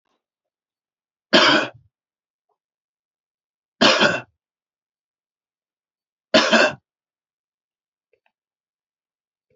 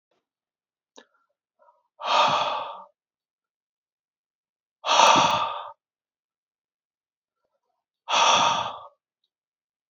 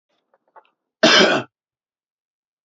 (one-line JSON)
{"three_cough_length": "9.6 s", "three_cough_amplitude": 29665, "three_cough_signal_mean_std_ratio": 0.26, "exhalation_length": "9.9 s", "exhalation_amplitude": 24321, "exhalation_signal_mean_std_ratio": 0.35, "cough_length": "2.6 s", "cough_amplitude": 28665, "cough_signal_mean_std_ratio": 0.3, "survey_phase": "beta (2021-08-13 to 2022-03-07)", "age": "45-64", "gender": "Male", "wearing_mask": "No", "symptom_none": true, "symptom_onset": "12 days", "smoker_status": "Never smoked", "respiratory_condition_asthma": false, "respiratory_condition_other": false, "recruitment_source": "REACT", "submission_delay": "1 day", "covid_test_result": "Negative", "covid_test_method": "RT-qPCR", "influenza_a_test_result": "Negative", "influenza_b_test_result": "Negative"}